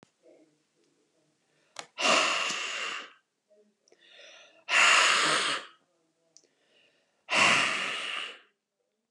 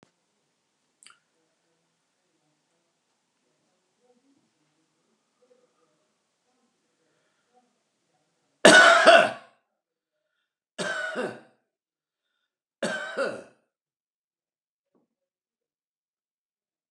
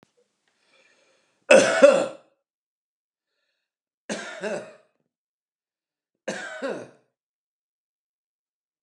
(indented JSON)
{
  "exhalation_length": "9.1 s",
  "exhalation_amplitude": 11451,
  "exhalation_signal_mean_std_ratio": 0.44,
  "cough_length": "16.9 s",
  "cough_amplitude": 32767,
  "cough_signal_mean_std_ratio": 0.19,
  "three_cough_length": "8.8 s",
  "three_cough_amplitude": 30279,
  "three_cough_signal_mean_std_ratio": 0.23,
  "survey_phase": "alpha (2021-03-01 to 2021-08-12)",
  "age": "65+",
  "gender": "Male",
  "wearing_mask": "No",
  "symptom_none": true,
  "smoker_status": "Ex-smoker",
  "respiratory_condition_asthma": false,
  "respiratory_condition_other": false,
  "recruitment_source": "REACT",
  "submission_delay": "1 day",
  "covid_test_result": "Negative",
  "covid_test_method": "RT-qPCR"
}